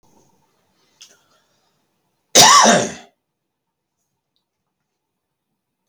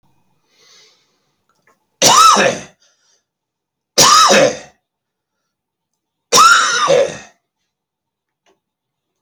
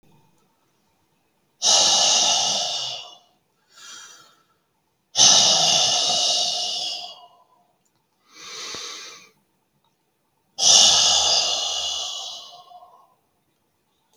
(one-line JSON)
{"cough_length": "5.9 s", "cough_amplitude": 32768, "cough_signal_mean_std_ratio": 0.24, "three_cough_length": "9.2 s", "three_cough_amplitude": 32768, "three_cough_signal_mean_std_ratio": 0.38, "exhalation_length": "14.2 s", "exhalation_amplitude": 30586, "exhalation_signal_mean_std_ratio": 0.48, "survey_phase": "alpha (2021-03-01 to 2021-08-12)", "age": "45-64", "gender": "Male", "wearing_mask": "No", "symptom_none": true, "symptom_onset": "12 days", "smoker_status": "Current smoker (e-cigarettes or vapes only)", "respiratory_condition_asthma": false, "respiratory_condition_other": true, "recruitment_source": "REACT", "submission_delay": "1 day", "covid_test_result": "Negative", "covid_test_method": "RT-qPCR"}